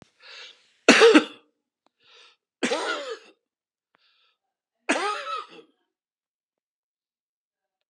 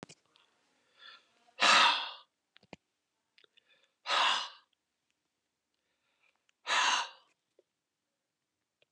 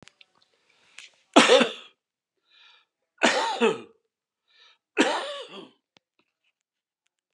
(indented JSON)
{
  "cough_length": "7.9 s",
  "cough_amplitude": 31407,
  "cough_signal_mean_std_ratio": 0.26,
  "exhalation_length": "8.9 s",
  "exhalation_amplitude": 9242,
  "exhalation_signal_mean_std_ratio": 0.29,
  "three_cough_length": "7.3 s",
  "three_cough_amplitude": 31264,
  "three_cough_signal_mean_std_ratio": 0.29,
  "survey_phase": "alpha (2021-03-01 to 2021-08-12)",
  "age": "65+",
  "gender": "Male",
  "wearing_mask": "No",
  "symptom_none": true,
  "smoker_status": "Never smoked",
  "respiratory_condition_asthma": false,
  "respiratory_condition_other": true,
  "recruitment_source": "REACT",
  "submission_delay": "2 days",
  "covid_test_result": "Negative",
  "covid_test_method": "RT-qPCR"
}